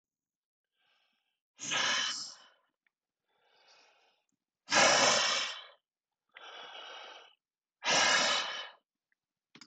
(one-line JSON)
{"exhalation_length": "9.7 s", "exhalation_amplitude": 8308, "exhalation_signal_mean_std_ratio": 0.39, "survey_phase": "beta (2021-08-13 to 2022-03-07)", "age": "65+", "gender": "Male", "wearing_mask": "No", "symptom_none": true, "smoker_status": "Ex-smoker", "respiratory_condition_asthma": false, "respiratory_condition_other": false, "recruitment_source": "REACT", "submission_delay": "1 day", "covid_test_result": "Negative", "covid_test_method": "RT-qPCR", "influenza_a_test_result": "Negative", "influenza_b_test_result": "Negative"}